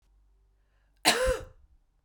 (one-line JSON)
{"cough_length": "2.0 s", "cough_amplitude": 14152, "cough_signal_mean_std_ratio": 0.34, "survey_phase": "beta (2021-08-13 to 2022-03-07)", "age": "18-44", "gender": "Female", "wearing_mask": "No", "symptom_cough_any": true, "symptom_runny_or_blocked_nose": true, "symptom_fatigue": true, "symptom_fever_high_temperature": true, "symptom_change_to_sense_of_smell_or_taste": true, "symptom_loss_of_taste": true, "symptom_onset": "3 days", "smoker_status": "Never smoked", "respiratory_condition_asthma": false, "respiratory_condition_other": false, "recruitment_source": "Test and Trace", "submission_delay": "2 days", "covid_test_result": "Positive", "covid_test_method": "RT-qPCR", "covid_ct_value": 16.2, "covid_ct_gene": "ORF1ab gene", "covid_ct_mean": 16.7, "covid_viral_load": "3300000 copies/ml", "covid_viral_load_category": "High viral load (>1M copies/ml)"}